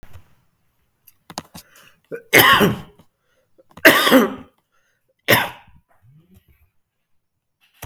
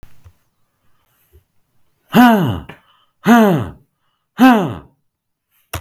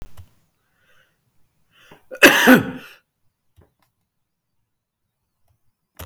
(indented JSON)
{
  "three_cough_length": "7.9 s",
  "three_cough_amplitude": 32768,
  "three_cough_signal_mean_std_ratio": 0.3,
  "exhalation_length": "5.8 s",
  "exhalation_amplitude": 32768,
  "exhalation_signal_mean_std_ratio": 0.38,
  "cough_length": "6.1 s",
  "cough_amplitude": 32768,
  "cough_signal_mean_std_ratio": 0.22,
  "survey_phase": "beta (2021-08-13 to 2022-03-07)",
  "age": "45-64",
  "gender": "Male",
  "wearing_mask": "No",
  "symptom_none": true,
  "smoker_status": "Current smoker (11 or more cigarettes per day)",
  "respiratory_condition_asthma": false,
  "respiratory_condition_other": false,
  "recruitment_source": "REACT",
  "submission_delay": "1 day",
  "covid_test_result": "Negative",
  "covid_test_method": "RT-qPCR",
  "influenza_a_test_result": "Negative",
  "influenza_b_test_result": "Negative"
}